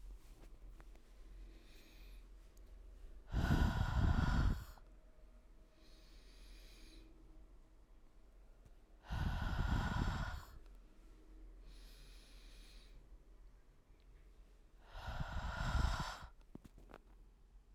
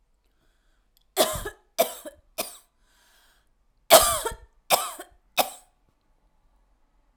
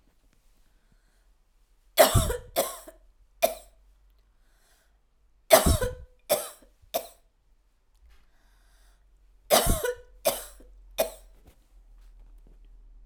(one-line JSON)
{"exhalation_length": "17.7 s", "exhalation_amplitude": 2499, "exhalation_signal_mean_std_ratio": 0.49, "cough_length": "7.2 s", "cough_amplitude": 32767, "cough_signal_mean_std_ratio": 0.26, "three_cough_length": "13.1 s", "three_cough_amplitude": 27676, "three_cough_signal_mean_std_ratio": 0.29, "survey_phase": "alpha (2021-03-01 to 2021-08-12)", "age": "45-64", "gender": "Female", "wearing_mask": "No", "symptom_fatigue": true, "smoker_status": "Never smoked", "respiratory_condition_asthma": false, "respiratory_condition_other": false, "recruitment_source": "REACT", "submission_delay": "9 days", "covid_test_result": "Negative", "covid_test_method": "RT-qPCR"}